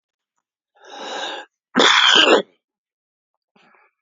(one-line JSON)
{"cough_length": "4.0 s", "cough_amplitude": 30884, "cough_signal_mean_std_ratio": 0.37, "survey_phase": "beta (2021-08-13 to 2022-03-07)", "age": "45-64", "gender": "Male", "wearing_mask": "No", "symptom_cough_any": true, "symptom_runny_or_blocked_nose": true, "symptom_shortness_of_breath": true, "symptom_headache": true, "smoker_status": "Current smoker (11 or more cigarettes per day)", "respiratory_condition_asthma": false, "respiratory_condition_other": true, "recruitment_source": "REACT", "submission_delay": "1 day", "covid_test_result": "Negative", "covid_test_method": "RT-qPCR", "influenza_a_test_result": "Negative", "influenza_b_test_result": "Negative"}